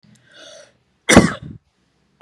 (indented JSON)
{
  "cough_length": "2.2 s",
  "cough_amplitude": 32768,
  "cough_signal_mean_std_ratio": 0.25,
  "survey_phase": "beta (2021-08-13 to 2022-03-07)",
  "age": "18-44",
  "gender": "Female",
  "wearing_mask": "No",
  "symptom_none": true,
  "smoker_status": "Current smoker (1 to 10 cigarettes per day)",
  "respiratory_condition_asthma": false,
  "respiratory_condition_other": false,
  "recruitment_source": "REACT",
  "submission_delay": "2 days",
  "covid_test_result": "Negative",
  "covid_test_method": "RT-qPCR",
  "influenza_a_test_result": "Negative",
  "influenza_b_test_result": "Negative"
}